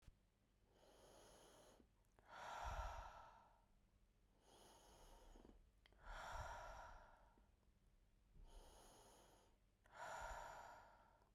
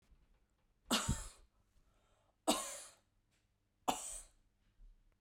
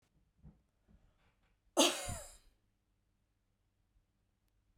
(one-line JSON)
{"exhalation_length": "11.3 s", "exhalation_amplitude": 405, "exhalation_signal_mean_std_ratio": 0.6, "three_cough_length": "5.2 s", "three_cough_amplitude": 4369, "three_cough_signal_mean_std_ratio": 0.32, "cough_length": "4.8 s", "cough_amplitude": 6384, "cough_signal_mean_std_ratio": 0.21, "survey_phase": "beta (2021-08-13 to 2022-03-07)", "age": "18-44", "gender": "Female", "wearing_mask": "No", "symptom_fatigue": true, "symptom_onset": "12 days", "smoker_status": "Never smoked", "respiratory_condition_asthma": false, "respiratory_condition_other": false, "recruitment_source": "REACT", "submission_delay": "2 days", "covid_test_result": "Negative", "covid_test_method": "RT-qPCR", "influenza_a_test_result": "Negative", "influenza_b_test_result": "Negative"}